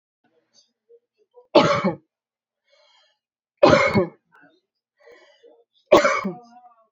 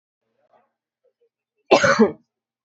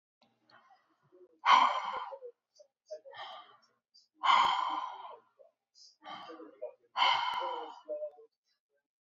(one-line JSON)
{"three_cough_length": "6.9 s", "three_cough_amplitude": 31708, "three_cough_signal_mean_std_ratio": 0.3, "cough_length": "2.6 s", "cough_amplitude": 27462, "cough_signal_mean_std_ratio": 0.28, "exhalation_length": "9.1 s", "exhalation_amplitude": 8568, "exhalation_signal_mean_std_ratio": 0.39, "survey_phase": "beta (2021-08-13 to 2022-03-07)", "age": "18-44", "gender": "Female", "wearing_mask": "No", "symptom_runny_or_blocked_nose": true, "smoker_status": "Ex-smoker", "respiratory_condition_asthma": true, "respiratory_condition_other": false, "recruitment_source": "Test and Trace", "submission_delay": "1 day", "covid_test_result": "Negative", "covid_test_method": "RT-qPCR"}